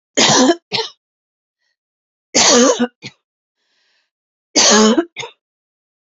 {"three_cough_length": "6.1 s", "three_cough_amplitude": 32259, "three_cough_signal_mean_std_ratio": 0.42, "survey_phase": "beta (2021-08-13 to 2022-03-07)", "age": "18-44", "gender": "Female", "wearing_mask": "No", "symptom_cough_any": true, "symptom_runny_or_blocked_nose": true, "symptom_fatigue": true, "smoker_status": "Current smoker (11 or more cigarettes per day)", "respiratory_condition_asthma": false, "respiratory_condition_other": false, "recruitment_source": "REACT", "submission_delay": "3 days", "covid_test_result": "Negative", "covid_test_method": "RT-qPCR", "influenza_a_test_result": "Unknown/Void", "influenza_b_test_result": "Unknown/Void"}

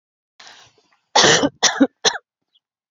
{"three_cough_length": "2.9 s", "three_cough_amplitude": 32768, "three_cough_signal_mean_std_ratio": 0.36, "survey_phase": "beta (2021-08-13 to 2022-03-07)", "age": "18-44", "gender": "Female", "wearing_mask": "No", "symptom_none": true, "symptom_onset": "3 days", "smoker_status": "Never smoked", "respiratory_condition_asthma": false, "respiratory_condition_other": false, "recruitment_source": "REACT", "submission_delay": "2 days", "covid_test_result": "Negative", "covid_test_method": "RT-qPCR", "influenza_a_test_result": "Negative", "influenza_b_test_result": "Negative"}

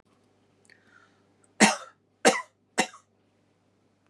{"three_cough_length": "4.1 s", "three_cough_amplitude": 19466, "three_cough_signal_mean_std_ratio": 0.22, "survey_phase": "beta (2021-08-13 to 2022-03-07)", "age": "45-64", "gender": "Female", "wearing_mask": "No", "symptom_none": true, "smoker_status": "Never smoked", "respiratory_condition_asthma": false, "respiratory_condition_other": false, "recruitment_source": "REACT", "submission_delay": "1 day", "covid_test_result": "Negative", "covid_test_method": "RT-qPCR", "influenza_a_test_result": "Negative", "influenza_b_test_result": "Negative"}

